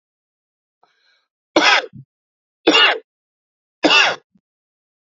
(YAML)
three_cough_length: 5.0 s
three_cough_amplitude: 32176
three_cough_signal_mean_std_ratio: 0.33
survey_phase: beta (2021-08-13 to 2022-03-07)
age: 45-64
gender: Male
wearing_mask: 'No'
symptom_cough_any: true
symptom_new_continuous_cough: true
symptom_runny_or_blocked_nose: true
symptom_change_to_sense_of_smell_or_taste: true
symptom_onset: 4 days
smoker_status: Never smoked
respiratory_condition_asthma: false
respiratory_condition_other: false
recruitment_source: Test and Trace
submission_delay: 2 days
covid_test_result: Positive
covid_test_method: ePCR